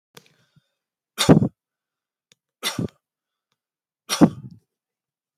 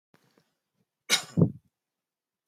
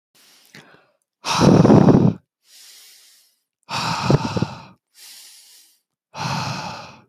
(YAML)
three_cough_length: 5.4 s
three_cough_amplitude: 27451
three_cough_signal_mean_std_ratio: 0.22
cough_length: 2.5 s
cough_amplitude: 15148
cough_signal_mean_std_ratio: 0.23
exhalation_length: 7.1 s
exhalation_amplitude: 26980
exhalation_signal_mean_std_ratio: 0.39
survey_phase: beta (2021-08-13 to 2022-03-07)
age: 18-44
gender: Male
wearing_mask: 'No'
symptom_none: true
smoker_status: Ex-smoker
respiratory_condition_asthma: false
respiratory_condition_other: false
recruitment_source: REACT
submission_delay: 1 day
covid_test_result: Negative
covid_test_method: RT-qPCR